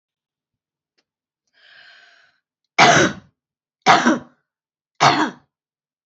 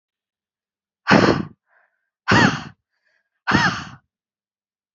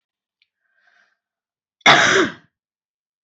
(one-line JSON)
{"three_cough_length": "6.1 s", "three_cough_amplitude": 29173, "three_cough_signal_mean_std_ratio": 0.31, "exhalation_length": "4.9 s", "exhalation_amplitude": 28712, "exhalation_signal_mean_std_ratio": 0.34, "cough_length": "3.2 s", "cough_amplitude": 30504, "cough_signal_mean_std_ratio": 0.29, "survey_phase": "beta (2021-08-13 to 2022-03-07)", "age": "18-44", "gender": "Female", "wearing_mask": "No", "symptom_cough_any": true, "symptom_runny_or_blocked_nose": true, "symptom_sore_throat": true, "symptom_fatigue": true, "symptom_fever_high_temperature": true, "symptom_headache": true, "smoker_status": "Never smoked", "respiratory_condition_asthma": false, "respiratory_condition_other": false, "recruitment_source": "Test and Trace", "submission_delay": "2 days", "covid_test_result": "Positive", "covid_test_method": "RT-qPCR"}